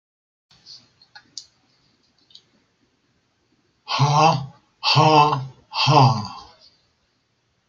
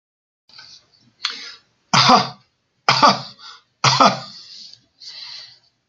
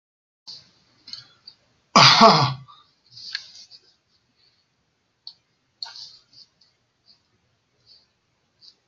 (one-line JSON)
{"exhalation_length": "7.7 s", "exhalation_amplitude": 25258, "exhalation_signal_mean_std_ratio": 0.37, "three_cough_length": "5.9 s", "three_cough_amplitude": 32767, "three_cough_signal_mean_std_ratio": 0.35, "cough_length": "8.9 s", "cough_amplitude": 32768, "cough_signal_mean_std_ratio": 0.22, "survey_phase": "beta (2021-08-13 to 2022-03-07)", "age": "65+", "gender": "Male", "wearing_mask": "No", "symptom_none": true, "smoker_status": "Never smoked", "respiratory_condition_asthma": false, "respiratory_condition_other": false, "recruitment_source": "REACT", "submission_delay": "1 day", "covid_test_result": "Negative", "covid_test_method": "RT-qPCR"}